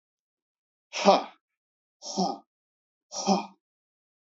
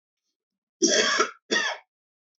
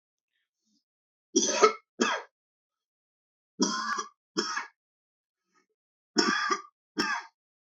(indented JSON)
{
  "exhalation_length": "4.3 s",
  "exhalation_amplitude": 19711,
  "exhalation_signal_mean_std_ratio": 0.29,
  "cough_length": "2.4 s",
  "cough_amplitude": 15175,
  "cough_signal_mean_std_ratio": 0.44,
  "three_cough_length": "7.8 s",
  "three_cough_amplitude": 16380,
  "three_cough_signal_mean_std_ratio": 0.36,
  "survey_phase": "beta (2021-08-13 to 2022-03-07)",
  "age": "45-64",
  "gender": "Male",
  "wearing_mask": "No",
  "symptom_none": true,
  "smoker_status": "Ex-smoker",
  "respiratory_condition_asthma": false,
  "respiratory_condition_other": false,
  "recruitment_source": "REACT",
  "submission_delay": "1 day",
  "covid_test_result": "Negative",
  "covid_test_method": "RT-qPCR",
  "influenza_a_test_result": "Negative",
  "influenza_b_test_result": "Negative"
}